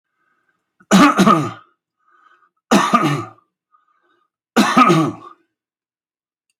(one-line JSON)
{"three_cough_length": "6.6 s", "three_cough_amplitude": 30521, "three_cough_signal_mean_std_ratio": 0.39, "survey_phase": "alpha (2021-03-01 to 2021-08-12)", "age": "65+", "gender": "Male", "wearing_mask": "No", "symptom_none": true, "smoker_status": "Ex-smoker", "respiratory_condition_asthma": false, "respiratory_condition_other": false, "recruitment_source": "REACT", "submission_delay": "2 days", "covid_test_result": "Negative", "covid_test_method": "RT-qPCR"}